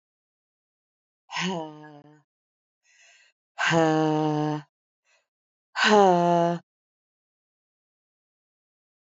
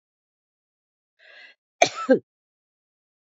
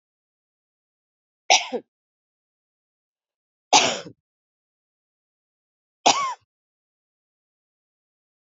{"exhalation_length": "9.1 s", "exhalation_amplitude": 18797, "exhalation_signal_mean_std_ratio": 0.35, "cough_length": "3.3 s", "cough_amplitude": 32733, "cough_signal_mean_std_ratio": 0.18, "three_cough_length": "8.4 s", "three_cough_amplitude": 30125, "three_cough_signal_mean_std_ratio": 0.2, "survey_phase": "beta (2021-08-13 to 2022-03-07)", "age": "65+", "gender": "Female", "wearing_mask": "No", "symptom_runny_or_blocked_nose": true, "symptom_sore_throat": true, "symptom_headache": true, "symptom_onset": "6 days", "smoker_status": "Ex-smoker", "respiratory_condition_asthma": false, "respiratory_condition_other": false, "recruitment_source": "REACT", "submission_delay": "1 day", "covid_test_result": "Negative", "covid_test_method": "RT-qPCR"}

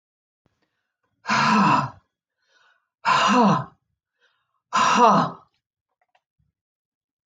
{"exhalation_length": "7.3 s", "exhalation_amplitude": 20917, "exhalation_signal_mean_std_ratio": 0.41, "survey_phase": "alpha (2021-03-01 to 2021-08-12)", "age": "45-64", "gender": "Female", "wearing_mask": "No", "symptom_none": true, "smoker_status": "Never smoked", "respiratory_condition_asthma": false, "respiratory_condition_other": false, "recruitment_source": "REACT", "submission_delay": "1 day", "covid_test_result": "Negative", "covid_test_method": "RT-qPCR"}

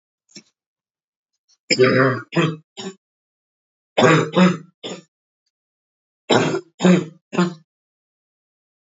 {"three_cough_length": "8.9 s", "three_cough_amplitude": 29844, "three_cough_signal_mean_std_ratio": 0.37, "survey_phase": "beta (2021-08-13 to 2022-03-07)", "age": "18-44", "gender": "Female", "wearing_mask": "No", "symptom_cough_any": true, "symptom_runny_or_blocked_nose": true, "symptom_sore_throat": true, "symptom_fatigue": true, "symptom_fever_high_temperature": true, "symptom_change_to_sense_of_smell_or_taste": true, "symptom_onset": "5 days", "smoker_status": "Never smoked", "respiratory_condition_asthma": false, "respiratory_condition_other": false, "recruitment_source": "Test and Trace", "submission_delay": "2 days", "covid_test_result": "Positive", "covid_test_method": "RT-qPCR", "covid_ct_value": 23.0, "covid_ct_gene": "N gene"}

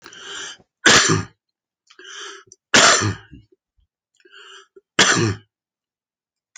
{"three_cough_length": "6.6 s", "three_cough_amplitude": 32767, "three_cough_signal_mean_std_ratio": 0.35, "survey_phase": "alpha (2021-03-01 to 2021-08-12)", "age": "65+", "gender": "Male", "wearing_mask": "No", "symptom_none": true, "smoker_status": "Current smoker (11 or more cigarettes per day)", "respiratory_condition_asthma": false, "respiratory_condition_other": false, "recruitment_source": "REACT", "submission_delay": "1 day", "covid_test_result": "Negative", "covid_test_method": "RT-qPCR"}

